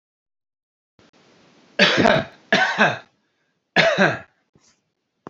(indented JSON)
{
  "three_cough_length": "5.3 s",
  "three_cough_amplitude": 28224,
  "three_cough_signal_mean_std_ratio": 0.38,
  "survey_phase": "beta (2021-08-13 to 2022-03-07)",
  "age": "45-64",
  "gender": "Male",
  "wearing_mask": "No",
  "symptom_none": true,
  "smoker_status": "Current smoker (1 to 10 cigarettes per day)",
  "respiratory_condition_asthma": false,
  "respiratory_condition_other": false,
  "recruitment_source": "REACT",
  "submission_delay": "6 days",
  "covid_test_result": "Negative",
  "covid_test_method": "RT-qPCR"
}